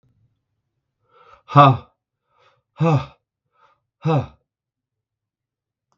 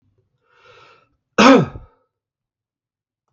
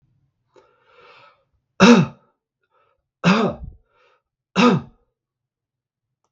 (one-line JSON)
{"exhalation_length": "6.0 s", "exhalation_amplitude": 32768, "exhalation_signal_mean_std_ratio": 0.25, "cough_length": "3.3 s", "cough_amplitude": 32768, "cough_signal_mean_std_ratio": 0.24, "three_cough_length": "6.3 s", "three_cough_amplitude": 32768, "three_cough_signal_mean_std_ratio": 0.28, "survey_phase": "beta (2021-08-13 to 2022-03-07)", "age": "45-64", "gender": "Male", "wearing_mask": "No", "symptom_sore_throat": true, "smoker_status": "Never smoked", "respiratory_condition_asthma": false, "respiratory_condition_other": false, "recruitment_source": "REACT", "submission_delay": "1 day", "covid_test_result": "Negative", "covid_test_method": "RT-qPCR", "influenza_a_test_result": "Negative", "influenza_b_test_result": "Negative"}